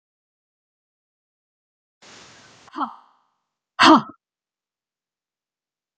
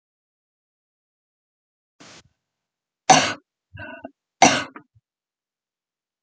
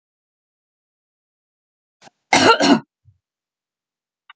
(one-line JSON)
{"exhalation_length": "6.0 s", "exhalation_amplitude": 28824, "exhalation_signal_mean_std_ratio": 0.17, "three_cough_length": "6.2 s", "three_cough_amplitude": 29490, "three_cough_signal_mean_std_ratio": 0.2, "cough_length": "4.4 s", "cough_amplitude": 30495, "cough_signal_mean_std_ratio": 0.25, "survey_phase": "beta (2021-08-13 to 2022-03-07)", "age": "45-64", "gender": "Female", "wearing_mask": "No", "symptom_none": true, "symptom_onset": "4 days", "smoker_status": "Never smoked", "respiratory_condition_asthma": true, "respiratory_condition_other": false, "recruitment_source": "REACT", "submission_delay": "3 days", "covid_test_result": "Negative", "covid_test_method": "RT-qPCR"}